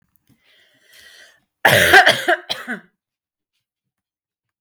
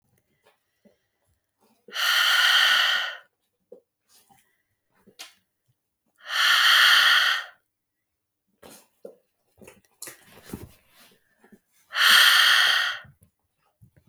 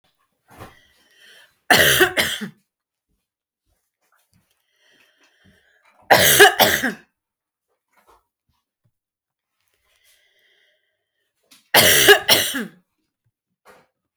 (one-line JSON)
{"cough_length": "4.6 s", "cough_amplitude": 32768, "cough_signal_mean_std_ratio": 0.31, "exhalation_length": "14.1 s", "exhalation_amplitude": 24401, "exhalation_signal_mean_std_ratio": 0.41, "three_cough_length": "14.2 s", "three_cough_amplitude": 32768, "three_cough_signal_mean_std_ratio": 0.29, "survey_phase": "beta (2021-08-13 to 2022-03-07)", "age": "18-44", "gender": "Female", "wearing_mask": "No", "symptom_cough_any": true, "symptom_runny_or_blocked_nose": true, "symptom_sore_throat": true, "smoker_status": "Never smoked", "respiratory_condition_asthma": false, "respiratory_condition_other": false, "recruitment_source": "REACT", "submission_delay": "6 days", "covid_test_result": "Negative", "covid_test_method": "RT-qPCR", "influenza_a_test_result": "Unknown/Void", "influenza_b_test_result": "Unknown/Void"}